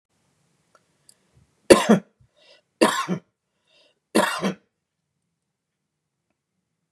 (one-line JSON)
{"three_cough_length": "6.9 s", "three_cough_amplitude": 32768, "three_cough_signal_mean_std_ratio": 0.23, "survey_phase": "beta (2021-08-13 to 2022-03-07)", "age": "45-64", "gender": "Male", "wearing_mask": "No", "symptom_none": true, "smoker_status": "Never smoked", "respiratory_condition_asthma": false, "respiratory_condition_other": false, "recruitment_source": "REACT", "submission_delay": "1 day", "covid_test_result": "Negative", "covid_test_method": "RT-qPCR", "influenza_a_test_result": "Negative", "influenza_b_test_result": "Negative"}